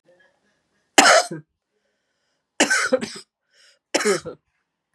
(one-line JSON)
{"three_cough_length": "4.9 s", "three_cough_amplitude": 32768, "three_cough_signal_mean_std_ratio": 0.33, "survey_phase": "beta (2021-08-13 to 2022-03-07)", "age": "18-44", "gender": "Female", "wearing_mask": "No", "symptom_runny_or_blocked_nose": true, "symptom_headache": true, "symptom_onset": "5 days", "smoker_status": "Ex-smoker", "respiratory_condition_asthma": false, "respiratory_condition_other": false, "recruitment_source": "Test and Trace", "submission_delay": "3 days", "covid_test_method": "RT-qPCR", "covid_ct_value": 31.5, "covid_ct_gene": "ORF1ab gene", "covid_ct_mean": 33.0, "covid_viral_load": "15 copies/ml", "covid_viral_load_category": "Minimal viral load (< 10K copies/ml)"}